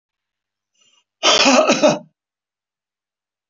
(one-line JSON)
{"cough_length": "3.5 s", "cough_amplitude": 27512, "cough_signal_mean_std_ratio": 0.37, "survey_phase": "alpha (2021-03-01 to 2021-08-12)", "age": "65+", "gender": "Male", "wearing_mask": "No", "symptom_none": true, "smoker_status": "Never smoked", "respiratory_condition_asthma": false, "respiratory_condition_other": false, "recruitment_source": "REACT", "submission_delay": "1 day", "covid_test_result": "Negative", "covid_test_method": "RT-qPCR"}